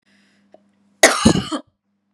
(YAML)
cough_length: 2.1 s
cough_amplitude: 32768
cough_signal_mean_std_ratio: 0.32
survey_phase: beta (2021-08-13 to 2022-03-07)
age: 18-44
gender: Female
wearing_mask: 'No'
symptom_runny_or_blocked_nose: true
symptom_sore_throat: true
symptom_fatigue: true
smoker_status: Ex-smoker
respiratory_condition_asthma: false
respiratory_condition_other: false
recruitment_source: Test and Trace
submission_delay: 1 day
covid_test_result: Negative
covid_test_method: RT-qPCR